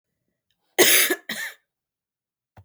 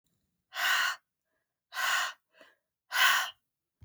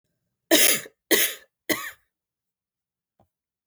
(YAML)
cough_length: 2.6 s
cough_amplitude: 30724
cough_signal_mean_std_ratio: 0.32
exhalation_length: 3.8 s
exhalation_amplitude: 9208
exhalation_signal_mean_std_ratio: 0.44
three_cough_length: 3.7 s
three_cough_amplitude: 22460
three_cough_signal_mean_std_ratio: 0.31
survey_phase: beta (2021-08-13 to 2022-03-07)
age: 45-64
gender: Female
wearing_mask: 'No'
symptom_cough_any: true
symptom_sore_throat: true
symptom_onset: 2 days
smoker_status: Never smoked
respiratory_condition_asthma: false
respiratory_condition_other: false
recruitment_source: Test and Trace
submission_delay: 2 days
covid_test_result: Positive
covid_test_method: RT-qPCR
covid_ct_value: 26.3
covid_ct_gene: ORF1ab gene
covid_ct_mean: 27.3
covid_viral_load: 1100 copies/ml
covid_viral_load_category: Minimal viral load (< 10K copies/ml)